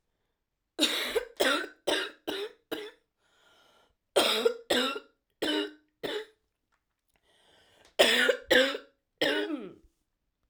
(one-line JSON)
{"three_cough_length": "10.5 s", "three_cough_amplitude": 15102, "three_cough_signal_mean_std_ratio": 0.44, "survey_phase": "alpha (2021-03-01 to 2021-08-12)", "age": "18-44", "gender": "Female", "wearing_mask": "No", "symptom_cough_any": true, "symptom_new_continuous_cough": true, "symptom_shortness_of_breath": true, "symptom_fever_high_temperature": true, "symptom_onset": "3 days", "smoker_status": "Ex-smoker", "respiratory_condition_asthma": false, "respiratory_condition_other": false, "recruitment_source": "Test and Trace", "submission_delay": "1 day", "covid_test_result": "Positive", "covid_test_method": "RT-qPCR", "covid_ct_value": 16.5, "covid_ct_gene": "ORF1ab gene", "covid_ct_mean": 16.8, "covid_viral_load": "3100000 copies/ml", "covid_viral_load_category": "High viral load (>1M copies/ml)"}